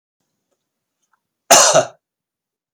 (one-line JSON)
{"cough_length": "2.7 s", "cough_amplitude": 32768, "cough_signal_mean_std_ratio": 0.28, "survey_phase": "beta (2021-08-13 to 2022-03-07)", "age": "45-64", "gender": "Male", "wearing_mask": "No", "symptom_fatigue": true, "symptom_onset": "12 days", "smoker_status": "Never smoked", "respiratory_condition_asthma": false, "respiratory_condition_other": false, "recruitment_source": "REACT", "submission_delay": "2 days", "covid_test_result": "Negative", "covid_test_method": "RT-qPCR", "influenza_a_test_result": "Negative", "influenza_b_test_result": "Negative"}